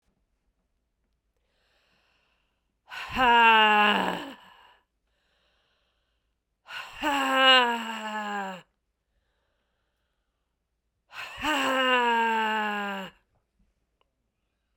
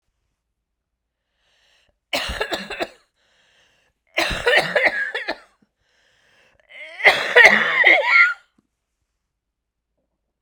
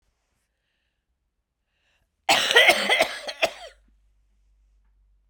{"exhalation_length": "14.8 s", "exhalation_amplitude": 17990, "exhalation_signal_mean_std_ratio": 0.41, "three_cough_length": "10.4 s", "three_cough_amplitude": 32768, "three_cough_signal_mean_std_ratio": 0.36, "cough_length": "5.3 s", "cough_amplitude": 27191, "cough_signal_mean_std_ratio": 0.31, "survey_phase": "beta (2021-08-13 to 2022-03-07)", "age": "45-64", "gender": "Female", "wearing_mask": "No", "symptom_cough_any": true, "symptom_runny_or_blocked_nose": true, "symptom_sore_throat": true, "symptom_fatigue": true, "symptom_headache": true, "smoker_status": "Ex-smoker", "respiratory_condition_asthma": false, "respiratory_condition_other": false, "recruitment_source": "Test and Trace", "submission_delay": "2 days", "covid_test_result": "Positive", "covid_test_method": "RT-qPCR"}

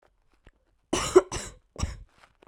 {"cough_length": "2.5 s", "cough_amplitude": 19396, "cough_signal_mean_std_ratio": 0.27, "survey_phase": "beta (2021-08-13 to 2022-03-07)", "age": "18-44", "gender": "Female", "wearing_mask": "No", "symptom_diarrhoea": true, "symptom_fatigue": true, "symptom_onset": "12 days", "smoker_status": "Never smoked", "respiratory_condition_asthma": false, "respiratory_condition_other": false, "recruitment_source": "REACT", "submission_delay": "1 day", "covid_test_result": "Negative", "covid_test_method": "RT-qPCR"}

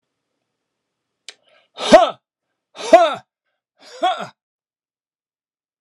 {"exhalation_length": "5.8 s", "exhalation_amplitude": 32768, "exhalation_signal_mean_std_ratio": 0.24, "survey_phase": "alpha (2021-03-01 to 2021-08-12)", "age": "65+", "gender": "Male", "wearing_mask": "No", "symptom_none": true, "smoker_status": "Never smoked", "respiratory_condition_asthma": false, "respiratory_condition_other": false, "recruitment_source": "REACT", "submission_delay": "3 days", "covid_test_result": "Negative", "covid_test_method": "RT-qPCR"}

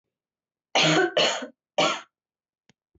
{"three_cough_length": "3.0 s", "three_cough_amplitude": 12529, "three_cough_signal_mean_std_ratio": 0.43, "survey_phase": "beta (2021-08-13 to 2022-03-07)", "age": "18-44", "gender": "Female", "wearing_mask": "No", "symptom_cough_any": true, "symptom_headache": true, "symptom_other": true, "symptom_onset": "4 days", "smoker_status": "Never smoked", "respiratory_condition_asthma": false, "respiratory_condition_other": false, "recruitment_source": "Test and Trace", "submission_delay": "2 days", "covid_test_result": "Positive", "covid_test_method": "RT-qPCR", "covid_ct_value": 33.4, "covid_ct_gene": "N gene"}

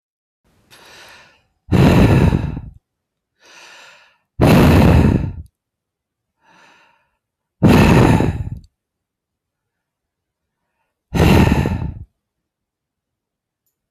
{"exhalation_length": "13.9 s", "exhalation_amplitude": 32768, "exhalation_signal_mean_std_ratio": 0.4, "survey_phase": "beta (2021-08-13 to 2022-03-07)", "age": "45-64", "gender": "Male", "wearing_mask": "No", "symptom_none": true, "smoker_status": "Ex-smoker", "respiratory_condition_asthma": false, "respiratory_condition_other": false, "recruitment_source": "REACT", "submission_delay": "2 days", "covid_test_result": "Negative", "covid_test_method": "RT-qPCR"}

